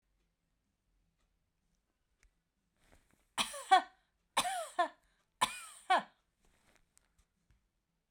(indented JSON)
{
  "three_cough_length": "8.1 s",
  "three_cough_amplitude": 7111,
  "three_cough_signal_mean_std_ratio": 0.24,
  "survey_phase": "beta (2021-08-13 to 2022-03-07)",
  "age": "45-64",
  "gender": "Female",
  "wearing_mask": "No",
  "symptom_none": true,
  "smoker_status": "Ex-smoker",
  "respiratory_condition_asthma": false,
  "respiratory_condition_other": false,
  "recruitment_source": "REACT",
  "submission_delay": "1 day",
  "covid_test_result": "Negative",
  "covid_test_method": "RT-qPCR"
}